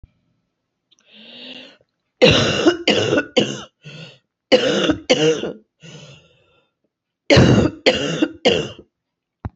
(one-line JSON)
{"cough_length": "9.6 s", "cough_amplitude": 30448, "cough_signal_mean_std_ratio": 0.45, "survey_phase": "beta (2021-08-13 to 2022-03-07)", "age": "45-64", "gender": "Female", "wearing_mask": "No", "symptom_cough_any": true, "symptom_new_continuous_cough": true, "symptom_runny_or_blocked_nose": true, "symptom_shortness_of_breath": true, "symptom_sore_throat": true, "symptom_abdominal_pain": true, "symptom_fatigue": true, "symptom_headache": true, "symptom_change_to_sense_of_smell_or_taste": true, "symptom_other": true, "smoker_status": "Never smoked", "respiratory_condition_asthma": false, "respiratory_condition_other": false, "recruitment_source": "Test and Trace", "submission_delay": "0 days", "covid_test_result": "Positive", "covid_test_method": "LFT"}